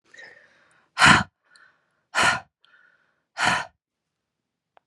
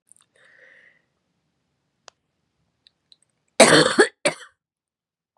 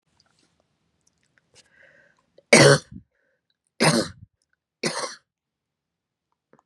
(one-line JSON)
{"exhalation_length": "4.9 s", "exhalation_amplitude": 31585, "exhalation_signal_mean_std_ratio": 0.29, "cough_length": "5.4 s", "cough_amplitude": 32767, "cough_signal_mean_std_ratio": 0.23, "three_cough_length": "6.7 s", "three_cough_amplitude": 32583, "three_cough_signal_mean_std_ratio": 0.23, "survey_phase": "beta (2021-08-13 to 2022-03-07)", "age": "45-64", "gender": "Female", "wearing_mask": "No", "symptom_new_continuous_cough": true, "smoker_status": "Never smoked", "respiratory_condition_asthma": false, "respiratory_condition_other": false, "recruitment_source": "Test and Trace", "submission_delay": "-1 day", "covid_test_result": "Negative", "covid_test_method": "LFT"}